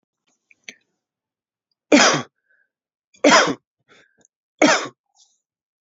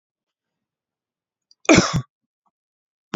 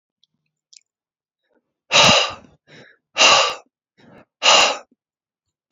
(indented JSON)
{
  "three_cough_length": "5.8 s",
  "three_cough_amplitude": 31345,
  "three_cough_signal_mean_std_ratio": 0.29,
  "cough_length": "3.2 s",
  "cough_amplitude": 28801,
  "cough_signal_mean_std_ratio": 0.22,
  "exhalation_length": "5.7 s",
  "exhalation_amplitude": 32767,
  "exhalation_signal_mean_std_ratio": 0.35,
  "survey_phase": "beta (2021-08-13 to 2022-03-07)",
  "age": "18-44",
  "gender": "Male",
  "wearing_mask": "No",
  "symptom_none": true,
  "smoker_status": "Never smoked",
  "respiratory_condition_asthma": false,
  "respiratory_condition_other": false,
  "recruitment_source": "REACT",
  "submission_delay": "1 day",
  "covid_test_result": "Negative",
  "covid_test_method": "RT-qPCR"
}